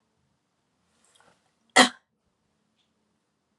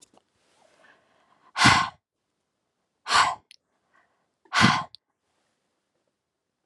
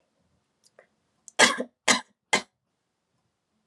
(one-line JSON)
{"cough_length": "3.6 s", "cough_amplitude": 26800, "cough_signal_mean_std_ratio": 0.14, "exhalation_length": "6.7 s", "exhalation_amplitude": 23537, "exhalation_signal_mean_std_ratio": 0.27, "three_cough_length": "3.7 s", "three_cough_amplitude": 23300, "three_cough_signal_mean_std_ratio": 0.23, "survey_phase": "beta (2021-08-13 to 2022-03-07)", "age": "18-44", "gender": "Female", "wearing_mask": "No", "symptom_cough_any": true, "symptom_runny_or_blocked_nose": true, "symptom_sore_throat": true, "symptom_fatigue": true, "symptom_onset": "5 days", "smoker_status": "Never smoked", "respiratory_condition_asthma": false, "respiratory_condition_other": false, "recruitment_source": "Test and Trace", "submission_delay": "2 days", "covid_test_result": "Positive", "covid_test_method": "RT-qPCR", "covid_ct_value": 16.5, "covid_ct_gene": "ORF1ab gene", "covid_ct_mean": 17.0, "covid_viral_load": "2700000 copies/ml", "covid_viral_load_category": "High viral load (>1M copies/ml)"}